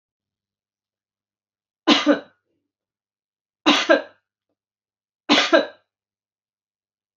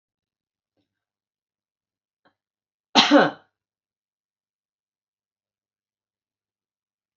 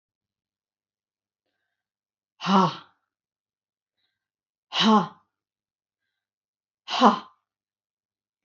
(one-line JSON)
{"three_cough_length": "7.2 s", "three_cough_amplitude": 28176, "three_cough_signal_mean_std_ratio": 0.27, "cough_length": "7.2 s", "cough_amplitude": 28427, "cough_signal_mean_std_ratio": 0.16, "exhalation_length": "8.4 s", "exhalation_amplitude": 25025, "exhalation_signal_mean_std_ratio": 0.24, "survey_phase": "beta (2021-08-13 to 2022-03-07)", "age": "45-64", "gender": "Female", "wearing_mask": "No", "symptom_runny_or_blocked_nose": true, "symptom_abdominal_pain": true, "smoker_status": "Never smoked", "respiratory_condition_asthma": false, "respiratory_condition_other": false, "recruitment_source": "REACT", "submission_delay": "2 days", "covid_test_result": "Negative", "covid_test_method": "RT-qPCR", "influenza_a_test_result": "Negative", "influenza_b_test_result": "Negative"}